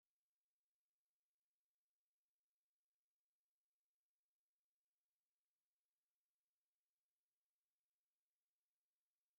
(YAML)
exhalation_length: 9.4 s
exhalation_amplitude: 2
exhalation_signal_mean_std_ratio: 0.19
survey_phase: beta (2021-08-13 to 2022-03-07)
age: 18-44
gender: Female
wearing_mask: 'No'
symptom_fatigue: true
smoker_status: Never smoked
respiratory_condition_asthma: false
respiratory_condition_other: false
recruitment_source: REACT
submission_delay: 3 days
covid_test_result: Negative
covid_test_method: RT-qPCR
influenza_a_test_result: Negative
influenza_b_test_result: Negative